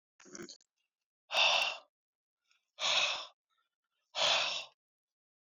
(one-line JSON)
{"exhalation_length": "5.5 s", "exhalation_amplitude": 5498, "exhalation_signal_mean_std_ratio": 0.4, "survey_phase": "beta (2021-08-13 to 2022-03-07)", "age": "18-44", "gender": "Male", "wearing_mask": "No", "symptom_cough_any": true, "smoker_status": "Current smoker (e-cigarettes or vapes only)", "respiratory_condition_asthma": false, "respiratory_condition_other": false, "recruitment_source": "REACT", "submission_delay": "3 days", "covid_test_result": "Negative", "covid_test_method": "RT-qPCR", "influenza_a_test_result": "Unknown/Void", "influenza_b_test_result": "Unknown/Void"}